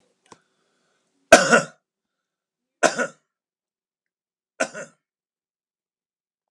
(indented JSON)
{
  "three_cough_length": "6.5 s",
  "three_cough_amplitude": 32768,
  "three_cough_signal_mean_std_ratio": 0.19,
  "survey_phase": "alpha (2021-03-01 to 2021-08-12)",
  "age": "65+",
  "gender": "Male",
  "wearing_mask": "No",
  "symptom_none": true,
  "smoker_status": "Never smoked",
  "respiratory_condition_asthma": false,
  "respiratory_condition_other": false,
  "recruitment_source": "REACT",
  "submission_delay": "1 day",
  "covid_test_result": "Negative",
  "covid_test_method": "RT-qPCR"
}